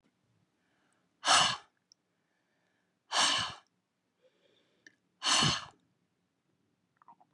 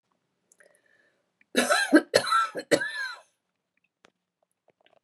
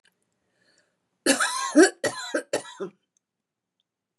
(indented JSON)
{
  "exhalation_length": "7.3 s",
  "exhalation_amplitude": 7571,
  "exhalation_signal_mean_std_ratio": 0.3,
  "three_cough_length": "5.0 s",
  "three_cough_amplitude": 18503,
  "three_cough_signal_mean_std_ratio": 0.34,
  "cough_length": "4.2 s",
  "cough_amplitude": 21386,
  "cough_signal_mean_std_ratio": 0.32,
  "survey_phase": "beta (2021-08-13 to 2022-03-07)",
  "age": "65+",
  "gender": "Female",
  "wearing_mask": "No",
  "symptom_none": true,
  "smoker_status": "Never smoked",
  "respiratory_condition_asthma": true,
  "respiratory_condition_other": false,
  "recruitment_source": "REACT",
  "submission_delay": "2 days",
  "covid_test_result": "Negative",
  "covid_test_method": "RT-qPCR",
  "influenza_a_test_result": "Negative",
  "influenza_b_test_result": "Negative"
}